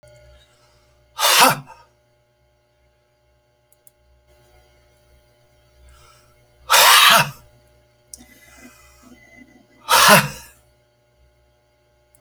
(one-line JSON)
{"exhalation_length": "12.2 s", "exhalation_amplitude": 32768, "exhalation_signal_mean_std_ratio": 0.28, "survey_phase": "beta (2021-08-13 to 2022-03-07)", "age": "45-64", "gender": "Male", "wearing_mask": "No", "symptom_none": true, "smoker_status": "Never smoked", "respiratory_condition_asthma": false, "respiratory_condition_other": false, "recruitment_source": "REACT", "submission_delay": "1 day", "covid_test_result": "Negative", "covid_test_method": "RT-qPCR"}